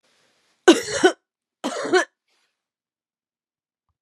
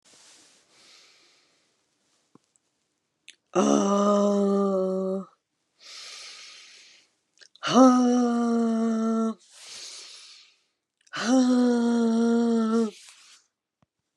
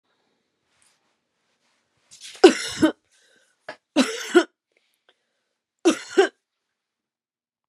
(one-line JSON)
{"cough_length": "4.0 s", "cough_amplitude": 32302, "cough_signal_mean_std_ratio": 0.27, "exhalation_length": "14.2 s", "exhalation_amplitude": 15086, "exhalation_signal_mean_std_ratio": 0.55, "three_cough_length": "7.7 s", "three_cough_amplitude": 31315, "three_cough_signal_mean_std_ratio": 0.23, "survey_phase": "beta (2021-08-13 to 2022-03-07)", "age": "45-64", "gender": "Female", "wearing_mask": "No", "symptom_cough_any": true, "symptom_runny_or_blocked_nose": true, "symptom_fatigue": true, "symptom_onset": "3 days", "smoker_status": "Never smoked", "respiratory_condition_asthma": false, "respiratory_condition_other": false, "recruitment_source": "Test and Trace", "submission_delay": "2 days", "covid_test_result": "Positive", "covid_test_method": "RT-qPCR"}